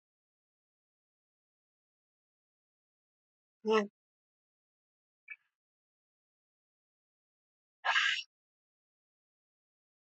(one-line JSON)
{"exhalation_length": "10.2 s", "exhalation_amplitude": 5126, "exhalation_signal_mean_std_ratio": 0.18, "survey_phase": "beta (2021-08-13 to 2022-03-07)", "age": "45-64", "gender": "Female", "wearing_mask": "No", "symptom_cough_any": true, "symptom_new_continuous_cough": true, "symptom_runny_or_blocked_nose": true, "symptom_shortness_of_breath": true, "symptom_sore_throat": true, "symptom_onset": "5 days", "smoker_status": "Never smoked", "respiratory_condition_asthma": true, "respiratory_condition_other": false, "recruitment_source": "Test and Trace", "submission_delay": "1 day", "covid_test_result": "Positive", "covid_test_method": "RT-qPCR", "covid_ct_value": 20.6, "covid_ct_gene": "ORF1ab gene", "covid_ct_mean": 21.1, "covid_viral_load": "120000 copies/ml", "covid_viral_load_category": "Low viral load (10K-1M copies/ml)"}